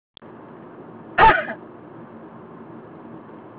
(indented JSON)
{
  "cough_length": "3.6 s",
  "cough_amplitude": 23741,
  "cough_signal_mean_std_ratio": 0.33,
  "survey_phase": "alpha (2021-03-01 to 2021-08-12)",
  "age": "45-64",
  "gender": "Female",
  "wearing_mask": "No",
  "symptom_none": true,
  "smoker_status": "Never smoked",
  "respiratory_condition_asthma": false,
  "respiratory_condition_other": false,
  "recruitment_source": "REACT",
  "submission_delay": "1 day",
  "covid_test_result": "Negative",
  "covid_test_method": "RT-qPCR"
}